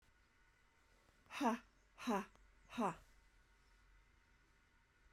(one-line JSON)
{"exhalation_length": "5.1 s", "exhalation_amplitude": 1697, "exhalation_signal_mean_std_ratio": 0.32, "survey_phase": "alpha (2021-03-01 to 2021-08-12)", "age": "45-64", "gender": "Female", "wearing_mask": "No", "symptom_cough_any": true, "symptom_fatigue": true, "symptom_headache": true, "smoker_status": "Never smoked", "respiratory_condition_asthma": false, "respiratory_condition_other": false, "recruitment_source": "Test and Trace", "submission_delay": "2 days", "covid_test_result": "Positive", "covid_test_method": "RT-qPCR"}